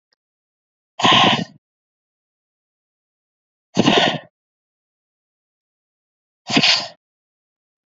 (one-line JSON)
{"exhalation_length": "7.9 s", "exhalation_amplitude": 29449, "exhalation_signal_mean_std_ratio": 0.3, "survey_phase": "beta (2021-08-13 to 2022-03-07)", "age": "18-44", "gender": "Female", "wearing_mask": "No", "symptom_fatigue": true, "symptom_onset": "3 days", "smoker_status": "Never smoked", "respiratory_condition_asthma": false, "respiratory_condition_other": false, "recruitment_source": "REACT", "submission_delay": "1 day", "covid_test_result": "Negative", "covid_test_method": "RT-qPCR", "influenza_a_test_result": "Negative", "influenza_b_test_result": "Negative"}